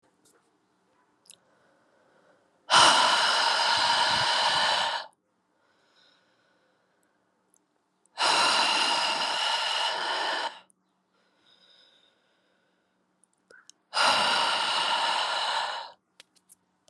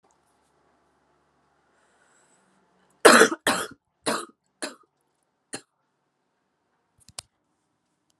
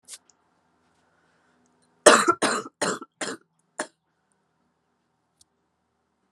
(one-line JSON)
{"exhalation_length": "16.9 s", "exhalation_amplitude": 17838, "exhalation_signal_mean_std_ratio": 0.53, "three_cough_length": "8.2 s", "three_cough_amplitude": 32767, "three_cough_signal_mean_std_ratio": 0.19, "cough_length": "6.3 s", "cough_amplitude": 32762, "cough_signal_mean_std_ratio": 0.22, "survey_phase": "alpha (2021-03-01 to 2021-08-12)", "age": "18-44", "gender": "Female", "wearing_mask": "No", "symptom_cough_any": true, "symptom_new_continuous_cough": true, "symptom_abdominal_pain": true, "symptom_diarrhoea": true, "symptom_fatigue": true, "symptom_headache": true, "symptom_onset": "2 days", "smoker_status": "Never smoked", "respiratory_condition_asthma": false, "respiratory_condition_other": false, "recruitment_source": "Test and Trace", "submission_delay": "2 days", "covid_test_result": "Positive", "covid_test_method": "RT-qPCR"}